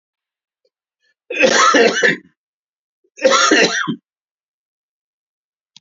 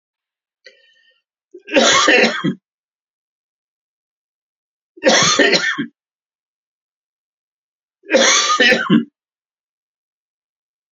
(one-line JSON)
{"cough_length": "5.8 s", "cough_amplitude": 32768, "cough_signal_mean_std_ratio": 0.41, "three_cough_length": "10.9 s", "three_cough_amplitude": 32767, "three_cough_signal_mean_std_ratio": 0.38, "survey_phase": "alpha (2021-03-01 to 2021-08-12)", "age": "65+", "gender": "Male", "wearing_mask": "No", "symptom_none": true, "smoker_status": "Never smoked", "respiratory_condition_asthma": false, "respiratory_condition_other": false, "recruitment_source": "REACT", "submission_delay": "1 day", "covid_test_result": "Negative", "covid_test_method": "RT-qPCR"}